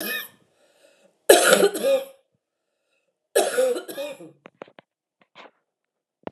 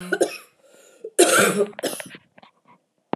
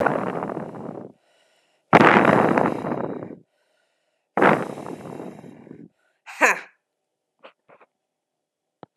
{"three_cough_length": "6.3 s", "three_cough_amplitude": 32768, "three_cough_signal_mean_std_ratio": 0.35, "cough_length": "3.2 s", "cough_amplitude": 28632, "cough_signal_mean_std_ratio": 0.41, "exhalation_length": "9.0 s", "exhalation_amplitude": 32767, "exhalation_signal_mean_std_ratio": 0.37, "survey_phase": "alpha (2021-03-01 to 2021-08-12)", "age": "45-64", "gender": "Female", "wearing_mask": "No", "symptom_cough_any": true, "symptom_fatigue": true, "symptom_fever_high_temperature": true, "symptom_headache": true, "symptom_onset": "3 days", "smoker_status": "Ex-smoker", "respiratory_condition_asthma": true, "respiratory_condition_other": false, "recruitment_source": "Test and Trace", "submission_delay": "2 days", "covid_test_result": "Positive", "covid_test_method": "RT-qPCR", "covid_ct_value": 23.3, "covid_ct_gene": "ORF1ab gene", "covid_ct_mean": 24.0, "covid_viral_load": "14000 copies/ml", "covid_viral_load_category": "Low viral load (10K-1M copies/ml)"}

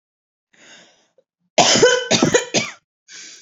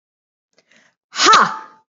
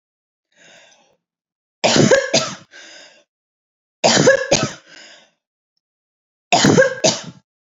{"cough_length": "3.4 s", "cough_amplitude": 31252, "cough_signal_mean_std_ratio": 0.42, "exhalation_length": "2.0 s", "exhalation_amplitude": 30169, "exhalation_signal_mean_std_ratio": 0.35, "three_cough_length": "7.8 s", "three_cough_amplitude": 32767, "three_cough_signal_mean_std_ratio": 0.38, "survey_phase": "beta (2021-08-13 to 2022-03-07)", "age": "18-44", "gender": "Female", "wearing_mask": "No", "symptom_none": true, "smoker_status": "Never smoked", "respiratory_condition_asthma": false, "respiratory_condition_other": false, "recruitment_source": "REACT", "submission_delay": "3 days", "covid_test_result": "Negative", "covid_test_method": "RT-qPCR", "influenza_a_test_result": "Negative", "influenza_b_test_result": "Negative"}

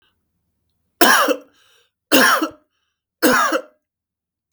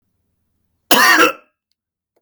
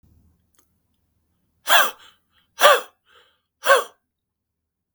{"three_cough_length": "4.5 s", "three_cough_amplitude": 32768, "three_cough_signal_mean_std_ratio": 0.4, "cough_length": "2.2 s", "cough_amplitude": 32768, "cough_signal_mean_std_ratio": 0.36, "exhalation_length": "4.9 s", "exhalation_amplitude": 32766, "exhalation_signal_mean_std_ratio": 0.27, "survey_phase": "beta (2021-08-13 to 2022-03-07)", "age": "45-64", "gender": "Male", "wearing_mask": "No", "symptom_none": true, "smoker_status": "Never smoked", "respiratory_condition_asthma": false, "respiratory_condition_other": false, "recruitment_source": "REACT", "submission_delay": "6 days", "covid_test_result": "Negative", "covid_test_method": "RT-qPCR", "influenza_a_test_result": "Negative", "influenza_b_test_result": "Negative"}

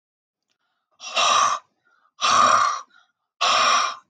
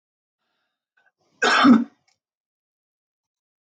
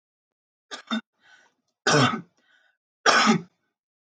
{"exhalation_length": "4.1 s", "exhalation_amplitude": 18679, "exhalation_signal_mean_std_ratio": 0.55, "cough_length": "3.7 s", "cough_amplitude": 21965, "cough_signal_mean_std_ratio": 0.27, "three_cough_length": "4.1 s", "three_cough_amplitude": 22311, "three_cough_signal_mean_std_ratio": 0.35, "survey_phase": "beta (2021-08-13 to 2022-03-07)", "age": "45-64", "gender": "Female", "wearing_mask": "No", "symptom_none": true, "smoker_status": "Ex-smoker", "respiratory_condition_asthma": false, "respiratory_condition_other": false, "recruitment_source": "REACT", "submission_delay": "4 days", "covid_test_result": "Negative", "covid_test_method": "RT-qPCR"}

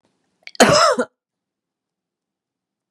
{"cough_length": "2.9 s", "cough_amplitude": 32768, "cough_signal_mean_std_ratio": 0.3, "survey_phase": "beta (2021-08-13 to 2022-03-07)", "age": "65+", "gender": "Female", "wearing_mask": "No", "symptom_none": true, "smoker_status": "Ex-smoker", "respiratory_condition_asthma": false, "respiratory_condition_other": false, "recruitment_source": "REACT", "submission_delay": "2 days", "covid_test_result": "Negative", "covid_test_method": "RT-qPCR", "influenza_a_test_result": "Unknown/Void", "influenza_b_test_result": "Unknown/Void"}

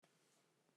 {"exhalation_length": "0.8 s", "exhalation_amplitude": 51, "exhalation_signal_mean_std_ratio": 0.97, "survey_phase": "beta (2021-08-13 to 2022-03-07)", "age": "45-64", "gender": "Male", "wearing_mask": "No", "symptom_cough_any": true, "symptom_runny_or_blocked_nose": true, "symptom_headache": true, "symptom_change_to_sense_of_smell_or_taste": true, "symptom_loss_of_taste": true, "smoker_status": "Ex-smoker", "respiratory_condition_asthma": false, "respiratory_condition_other": false, "recruitment_source": "Test and Trace", "submission_delay": "1 day", "covid_test_result": "Positive", "covid_test_method": "RT-qPCR", "covid_ct_value": 21.9, "covid_ct_gene": "ORF1ab gene", "covid_ct_mean": 22.6, "covid_viral_load": "40000 copies/ml", "covid_viral_load_category": "Low viral load (10K-1M copies/ml)"}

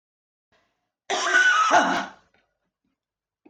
{"cough_length": "3.5 s", "cough_amplitude": 15097, "cough_signal_mean_std_ratio": 0.44, "survey_phase": "beta (2021-08-13 to 2022-03-07)", "age": "65+", "gender": "Female", "wearing_mask": "No", "symptom_none": true, "smoker_status": "Ex-smoker", "respiratory_condition_asthma": false, "respiratory_condition_other": false, "recruitment_source": "REACT", "submission_delay": "2 days", "covid_test_result": "Negative", "covid_test_method": "RT-qPCR"}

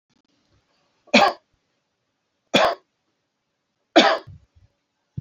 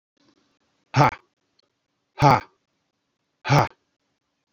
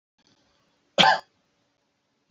{"three_cough_length": "5.2 s", "three_cough_amplitude": 29411, "three_cough_signal_mean_std_ratio": 0.27, "exhalation_length": "4.5 s", "exhalation_amplitude": 28130, "exhalation_signal_mean_std_ratio": 0.26, "cough_length": "2.3 s", "cough_amplitude": 25658, "cough_signal_mean_std_ratio": 0.23, "survey_phase": "beta (2021-08-13 to 2022-03-07)", "age": "45-64", "gender": "Male", "wearing_mask": "No", "symptom_none": true, "smoker_status": "Never smoked", "respiratory_condition_asthma": false, "respiratory_condition_other": false, "recruitment_source": "REACT", "submission_delay": "1 day", "covid_test_result": "Negative", "covid_test_method": "RT-qPCR"}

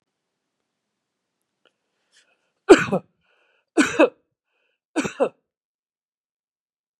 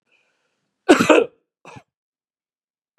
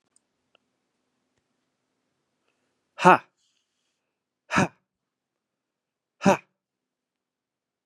{"three_cough_length": "7.0 s", "three_cough_amplitude": 32767, "three_cough_signal_mean_std_ratio": 0.2, "cough_length": "3.0 s", "cough_amplitude": 32767, "cough_signal_mean_std_ratio": 0.25, "exhalation_length": "7.9 s", "exhalation_amplitude": 29915, "exhalation_signal_mean_std_ratio": 0.15, "survey_phase": "beta (2021-08-13 to 2022-03-07)", "age": "65+", "gender": "Male", "wearing_mask": "No", "symptom_none": true, "smoker_status": "Never smoked", "respiratory_condition_asthma": false, "respiratory_condition_other": false, "recruitment_source": "REACT", "submission_delay": "3 days", "covid_test_result": "Negative", "covid_test_method": "RT-qPCR", "influenza_a_test_result": "Negative", "influenza_b_test_result": "Negative"}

